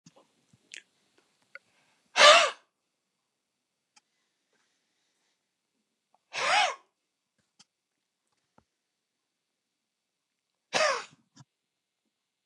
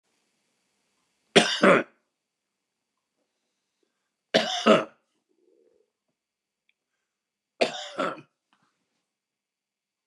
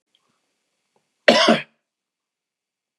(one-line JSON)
{"exhalation_length": "12.5 s", "exhalation_amplitude": 20203, "exhalation_signal_mean_std_ratio": 0.19, "three_cough_length": "10.1 s", "three_cough_amplitude": 27610, "three_cough_signal_mean_std_ratio": 0.23, "cough_length": "3.0 s", "cough_amplitude": 32768, "cough_signal_mean_std_ratio": 0.25, "survey_phase": "beta (2021-08-13 to 2022-03-07)", "age": "45-64", "gender": "Male", "wearing_mask": "No", "symptom_none": true, "smoker_status": "Ex-smoker", "respiratory_condition_asthma": true, "respiratory_condition_other": false, "recruitment_source": "REACT", "submission_delay": "1 day", "covid_test_result": "Negative", "covid_test_method": "RT-qPCR", "influenza_a_test_result": "Negative", "influenza_b_test_result": "Negative"}